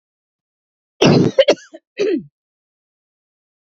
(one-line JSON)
{"cough_length": "3.8 s", "cough_amplitude": 28891, "cough_signal_mean_std_ratio": 0.33, "survey_phase": "beta (2021-08-13 to 2022-03-07)", "age": "45-64", "gender": "Female", "wearing_mask": "No", "symptom_cough_any": true, "symptom_runny_or_blocked_nose": true, "symptom_onset": "5 days", "smoker_status": "Never smoked", "respiratory_condition_asthma": true, "respiratory_condition_other": false, "recruitment_source": "Test and Trace", "submission_delay": "1 day", "covid_test_result": "Positive", "covid_test_method": "RT-qPCR", "covid_ct_value": 17.1, "covid_ct_gene": "ORF1ab gene", "covid_ct_mean": 18.5, "covid_viral_load": "860000 copies/ml", "covid_viral_load_category": "Low viral load (10K-1M copies/ml)"}